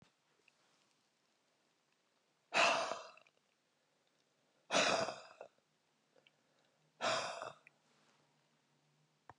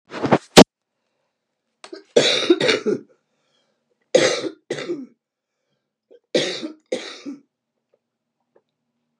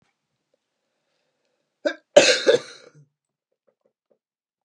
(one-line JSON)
{"exhalation_length": "9.4 s", "exhalation_amplitude": 3812, "exhalation_signal_mean_std_ratio": 0.29, "three_cough_length": "9.2 s", "three_cough_amplitude": 32768, "three_cough_signal_mean_std_ratio": 0.29, "cough_length": "4.6 s", "cough_amplitude": 32768, "cough_signal_mean_std_ratio": 0.22, "survey_phase": "beta (2021-08-13 to 2022-03-07)", "age": "65+", "gender": "Female", "wearing_mask": "No", "symptom_cough_any": true, "smoker_status": "Never smoked", "respiratory_condition_asthma": false, "respiratory_condition_other": true, "recruitment_source": "REACT", "submission_delay": "2 days", "covid_test_result": "Negative", "covid_test_method": "RT-qPCR", "influenza_a_test_result": "Unknown/Void", "influenza_b_test_result": "Unknown/Void"}